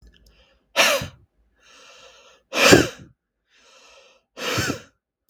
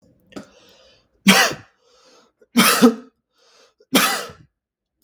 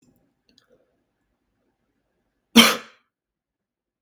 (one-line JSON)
{"exhalation_length": "5.3 s", "exhalation_amplitude": 32767, "exhalation_signal_mean_std_ratio": 0.31, "three_cough_length": "5.0 s", "three_cough_amplitude": 32767, "three_cough_signal_mean_std_ratio": 0.34, "cough_length": "4.0 s", "cough_amplitude": 32768, "cough_signal_mean_std_ratio": 0.16, "survey_phase": "beta (2021-08-13 to 2022-03-07)", "age": "18-44", "gender": "Male", "wearing_mask": "No", "symptom_none": true, "smoker_status": "Never smoked", "respiratory_condition_asthma": false, "respiratory_condition_other": false, "recruitment_source": "REACT", "submission_delay": "2 days", "covid_test_result": "Negative", "covid_test_method": "RT-qPCR", "influenza_a_test_result": "Negative", "influenza_b_test_result": "Negative"}